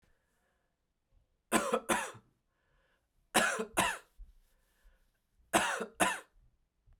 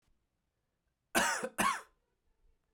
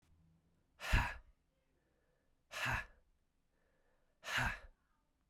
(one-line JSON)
{"three_cough_length": "7.0 s", "three_cough_amplitude": 6876, "three_cough_signal_mean_std_ratio": 0.35, "cough_length": "2.7 s", "cough_amplitude": 4937, "cough_signal_mean_std_ratio": 0.35, "exhalation_length": "5.3 s", "exhalation_amplitude": 3561, "exhalation_signal_mean_std_ratio": 0.32, "survey_phase": "beta (2021-08-13 to 2022-03-07)", "age": "45-64", "gender": "Male", "wearing_mask": "No", "symptom_cough_any": true, "symptom_runny_or_blocked_nose": true, "symptom_fatigue": true, "symptom_fever_high_temperature": true, "symptom_onset": "3 days", "smoker_status": "Never smoked", "respiratory_condition_asthma": false, "respiratory_condition_other": false, "recruitment_source": "Test and Trace", "submission_delay": "2 days", "covid_test_result": "Positive", "covid_test_method": "RT-qPCR"}